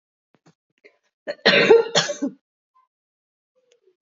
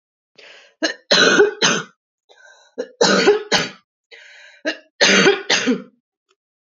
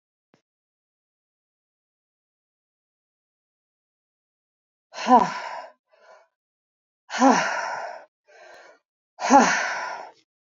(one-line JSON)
{"cough_length": "4.0 s", "cough_amplitude": 27436, "cough_signal_mean_std_ratio": 0.31, "three_cough_length": "6.7 s", "three_cough_amplitude": 32768, "three_cough_signal_mean_std_ratio": 0.47, "exhalation_length": "10.4 s", "exhalation_amplitude": 26252, "exhalation_signal_mean_std_ratio": 0.28, "survey_phase": "beta (2021-08-13 to 2022-03-07)", "age": "18-44", "gender": "Female", "wearing_mask": "No", "symptom_cough_any": true, "symptom_runny_or_blocked_nose": true, "symptom_onset": "4 days", "smoker_status": "Never smoked", "respiratory_condition_asthma": false, "respiratory_condition_other": false, "recruitment_source": "Test and Trace", "submission_delay": "2 days", "covid_test_result": "Positive", "covid_test_method": "RT-qPCR", "covid_ct_value": 11.9, "covid_ct_gene": "ORF1ab gene"}